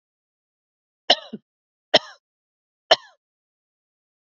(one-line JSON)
{"three_cough_length": "4.3 s", "three_cough_amplitude": 29999, "three_cough_signal_mean_std_ratio": 0.15, "survey_phase": "beta (2021-08-13 to 2022-03-07)", "age": "45-64", "gender": "Female", "wearing_mask": "No", "symptom_none": true, "smoker_status": "Never smoked", "respiratory_condition_asthma": true, "respiratory_condition_other": false, "recruitment_source": "REACT", "submission_delay": "1 day", "covid_test_result": "Negative", "covid_test_method": "RT-qPCR", "influenza_a_test_result": "Negative", "influenza_b_test_result": "Negative"}